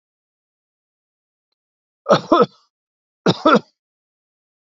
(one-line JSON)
{"cough_length": "4.7 s", "cough_amplitude": 29474, "cough_signal_mean_std_ratio": 0.25, "survey_phase": "beta (2021-08-13 to 2022-03-07)", "age": "65+", "gender": "Male", "wearing_mask": "No", "symptom_none": true, "smoker_status": "Never smoked", "respiratory_condition_asthma": false, "respiratory_condition_other": false, "recruitment_source": "REACT", "submission_delay": "2 days", "covid_test_result": "Negative", "covid_test_method": "RT-qPCR", "influenza_a_test_result": "Negative", "influenza_b_test_result": "Negative"}